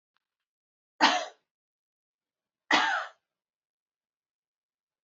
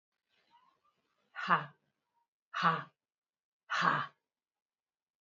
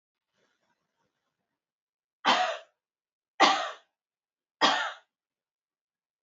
{"cough_length": "5.0 s", "cough_amplitude": 15504, "cough_signal_mean_std_ratio": 0.25, "exhalation_length": "5.2 s", "exhalation_amplitude": 7545, "exhalation_signal_mean_std_ratio": 0.3, "three_cough_length": "6.2 s", "three_cough_amplitude": 13975, "three_cough_signal_mean_std_ratio": 0.28, "survey_phase": "alpha (2021-03-01 to 2021-08-12)", "age": "65+", "gender": "Female", "wearing_mask": "No", "symptom_none": true, "smoker_status": "Ex-smoker", "respiratory_condition_asthma": false, "respiratory_condition_other": false, "recruitment_source": "REACT", "submission_delay": "2 days", "covid_test_result": "Negative", "covid_test_method": "RT-qPCR"}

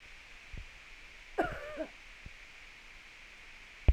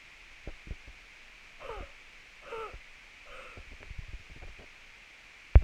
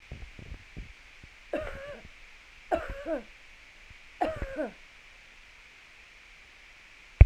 {"cough_length": "3.9 s", "cough_amplitude": 7879, "cough_signal_mean_std_ratio": 0.33, "exhalation_length": "5.6 s", "exhalation_amplitude": 17903, "exhalation_signal_mean_std_ratio": 0.22, "three_cough_length": "7.3 s", "three_cough_amplitude": 27141, "three_cough_signal_mean_std_ratio": 0.23, "survey_phase": "beta (2021-08-13 to 2022-03-07)", "age": "45-64", "gender": "Female", "wearing_mask": "No", "symptom_none": true, "smoker_status": "Ex-smoker", "respiratory_condition_asthma": false, "respiratory_condition_other": true, "recruitment_source": "REACT", "submission_delay": "1 day", "covid_test_result": "Negative", "covid_test_method": "RT-qPCR"}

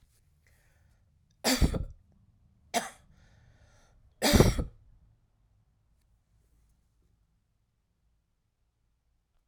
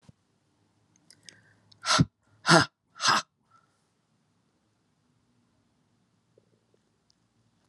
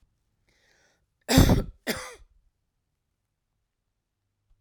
{"three_cough_length": "9.5 s", "three_cough_amplitude": 16842, "three_cough_signal_mean_std_ratio": 0.23, "exhalation_length": "7.7 s", "exhalation_amplitude": 23784, "exhalation_signal_mean_std_ratio": 0.21, "cough_length": "4.6 s", "cough_amplitude": 22602, "cough_signal_mean_std_ratio": 0.23, "survey_phase": "alpha (2021-03-01 to 2021-08-12)", "age": "65+", "gender": "Female", "wearing_mask": "No", "symptom_cough_any": true, "symptom_new_continuous_cough": true, "symptom_fatigue": true, "symptom_headache": true, "symptom_onset": "3 days", "smoker_status": "Never smoked", "respiratory_condition_asthma": false, "respiratory_condition_other": false, "recruitment_source": "Test and Trace", "submission_delay": "1 day", "covid_test_result": "Positive", "covid_test_method": "RT-qPCR", "covid_ct_value": 15.9, "covid_ct_gene": "ORF1ab gene", "covid_ct_mean": 16.2, "covid_viral_load": "4800000 copies/ml", "covid_viral_load_category": "High viral load (>1M copies/ml)"}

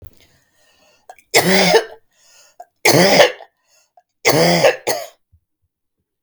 {"three_cough_length": "6.2 s", "three_cough_amplitude": 32768, "three_cough_signal_mean_std_ratio": 0.41, "survey_phase": "beta (2021-08-13 to 2022-03-07)", "age": "18-44", "gender": "Female", "wearing_mask": "No", "symptom_none": true, "smoker_status": "Never smoked", "respiratory_condition_asthma": false, "respiratory_condition_other": false, "recruitment_source": "REACT", "submission_delay": "2 days", "covid_test_result": "Negative", "covid_test_method": "RT-qPCR", "influenza_a_test_result": "Negative", "influenza_b_test_result": "Negative"}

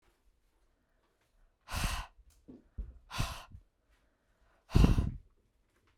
{"exhalation_length": "6.0 s", "exhalation_amplitude": 9443, "exhalation_signal_mean_std_ratio": 0.28, "survey_phase": "beta (2021-08-13 to 2022-03-07)", "age": "18-44", "gender": "Female", "wearing_mask": "No", "symptom_none": true, "smoker_status": "Ex-smoker", "respiratory_condition_asthma": false, "respiratory_condition_other": false, "recruitment_source": "REACT", "submission_delay": "1 day", "covid_test_result": "Negative", "covid_test_method": "RT-qPCR", "influenza_a_test_result": "Negative", "influenza_b_test_result": "Negative"}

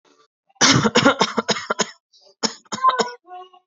{"cough_length": "3.7 s", "cough_amplitude": 29854, "cough_signal_mean_std_ratio": 0.45, "survey_phase": "beta (2021-08-13 to 2022-03-07)", "age": "18-44", "gender": "Female", "wearing_mask": "No", "symptom_shortness_of_breath": true, "symptom_diarrhoea": true, "symptom_headache": true, "symptom_onset": "13 days", "smoker_status": "Current smoker (1 to 10 cigarettes per day)", "respiratory_condition_asthma": false, "respiratory_condition_other": false, "recruitment_source": "REACT", "submission_delay": "2 days", "covid_test_result": "Negative", "covid_test_method": "RT-qPCR"}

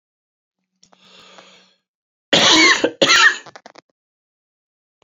{"cough_length": "5.0 s", "cough_amplitude": 32768, "cough_signal_mean_std_ratio": 0.35, "survey_phase": "beta (2021-08-13 to 2022-03-07)", "age": "18-44", "gender": "Male", "wearing_mask": "No", "symptom_none": true, "smoker_status": "Ex-smoker", "respiratory_condition_asthma": true, "respiratory_condition_other": false, "recruitment_source": "REACT", "submission_delay": "5 days", "covid_test_result": "Negative", "covid_test_method": "RT-qPCR", "influenza_a_test_result": "Negative", "influenza_b_test_result": "Negative"}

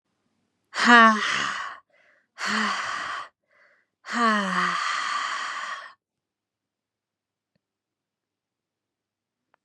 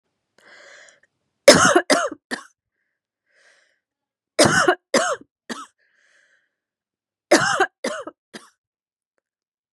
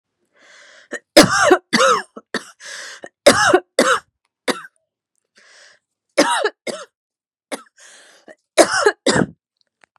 {"exhalation_length": "9.6 s", "exhalation_amplitude": 28899, "exhalation_signal_mean_std_ratio": 0.38, "three_cough_length": "9.7 s", "three_cough_amplitude": 32768, "three_cough_signal_mean_std_ratio": 0.29, "cough_length": "10.0 s", "cough_amplitude": 32768, "cough_signal_mean_std_ratio": 0.36, "survey_phase": "beta (2021-08-13 to 2022-03-07)", "age": "18-44", "gender": "Female", "wearing_mask": "No", "symptom_cough_any": true, "symptom_runny_or_blocked_nose": true, "symptom_sore_throat": true, "symptom_onset": "3 days", "smoker_status": "Ex-smoker", "respiratory_condition_asthma": false, "respiratory_condition_other": false, "recruitment_source": "REACT", "submission_delay": "1 day", "covid_test_result": "Negative", "covid_test_method": "RT-qPCR", "influenza_a_test_result": "Negative", "influenza_b_test_result": "Negative"}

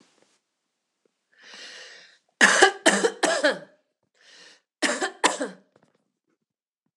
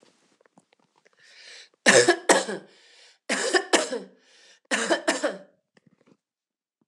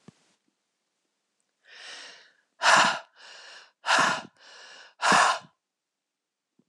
{"cough_length": "7.0 s", "cough_amplitude": 26028, "cough_signal_mean_std_ratio": 0.32, "three_cough_length": "6.9 s", "three_cough_amplitude": 25311, "three_cough_signal_mean_std_ratio": 0.35, "exhalation_length": "6.7 s", "exhalation_amplitude": 18394, "exhalation_signal_mean_std_ratio": 0.33, "survey_phase": "alpha (2021-03-01 to 2021-08-12)", "age": "45-64", "gender": "Female", "wearing_mask": "No", "symptom_none": true, "symptom_onset": "8 days", "smoker_status": "Ex-smoker", "respiratory_condition_asthma": false, "respiratory_condition_other": false, "recruitment_source": "REACT", "submission_delay": "4 days", "covid_test_result": "Negative", "covid_test_method": "RT-qPCR"}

